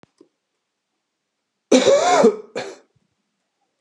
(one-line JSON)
{"cough_length": "3.8 s", "cough_amplitude": 28457, "cough_signal_mean_std_ratio": 0.35, "survey_phase": "beta (2021-08-13 to 2022-03-07)", "age": "45-64", "gender": "Male", "wearing_mask": "No", "symptom_cough_any": true, "symptom_runny_or_blocked_nose": true, "symptom_headache": true, "symptom_change_to_sense_of_smell_or_taste": true, "symptom_loss_of_taste": true, "symptom_onset": "6 days", "smoker_status": "Ex-smoker", "respiratory_condition_asthma": false, "respiratory_condition_other": false, "recruitment_source": "Test and Trace", "submission_delay": "2 days", "covid_test_result": "Positive", "covid_test_method": "RT-qPCR"}